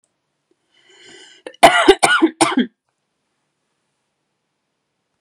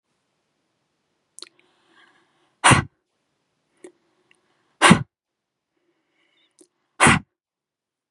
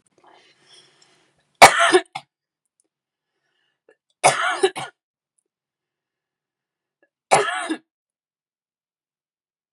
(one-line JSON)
{"cough_length": "5.2 s", "cough_amplitude": 32768, "cough_signal_mean_std_ratio": 0.29, "exhalation_length": "8.1 s", "exhalation_amplitude": 32180, "exhalation_signal_mean_std_ratio": 0.2, "three_cough_length": "9.7 s", "three_cough_amplitude": 32768, "three_cough_signal_mean_std_ratio": 0.22, "survey_phase": "beta (2021-08-13 to 2022-03-07)", "age": "18-44", "gender": "Female", "wearing_mask": "No", "symptom_none": true, "smoker_status": "Never smoked", "respiratory_condition_asthma": false, "respiratory_condition_other": false, "recruitment_source": "REACT", "submission_delay": "2 days", "covid_test_result": "Negative", "covid_test_method": "RT-qPCR", "influenza_a_test_result": "Negative", "influenza_b_test_result": "Negative"}